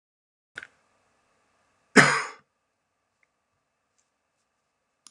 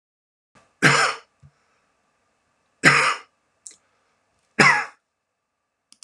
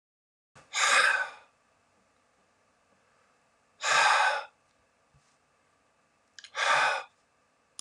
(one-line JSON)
{"cough_length": "5.1 s", "cough_amplitude": 31821, "cough_signal_mean_std_ratio": 0.16, "three_cough_length": "6.0 s", "three_cough_amplitude": 32767, "three_cough_signal_mean_std_ratio": 0.29, "exhalation_length": "7.8 s", "exhalation_amplitude": 10273, "exhalation_signal_mean_std_ratio": 0.37, "survey_phase": "alpha (2021-03-01 to 2021-08-12)", "age": "45-64", "gender": "Male", "wearing_mask": "No", "symptom_none": true, "smoker_status": "Never smoked", "respiratory_condition_asthma": false, "respiratory_condition_other": false, "recruitment_source": "REACT", "submission_delay": "1 day", "covid_test_result": "Negative", "covid_test_method": "RT-qPCR"}